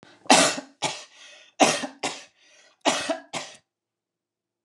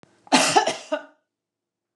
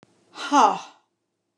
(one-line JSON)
{"three_cough_length": "4.6 s", "three_cough_amplitude": 29099, "three_cough_signal_mean_std_ratio": 0.35, "cough_length": "2.0 s", "cough_amplitude": 23925, "cough_signal_mean_std_ratio": 0.38, "exhalation_length": "1.6 s", "exhalation_amplitude": 21195, "exhalation_signal_mean_std_ratio": 0.35, "survey_phase": "beta (2021-08-13 to 2022-03-07)", "age": "65+", "gender": "Female", "wearing_mask": "No", "symptom_none": true, "smoker_status": "Never smoked", "respiratory_condition_asthma": false, "respiratory_condition_other": false, "recruitment_source": "REACT", "submission_delay": "1 day", "covid_test_result": "Negative", "covid_test_method": "RT-qPCR"}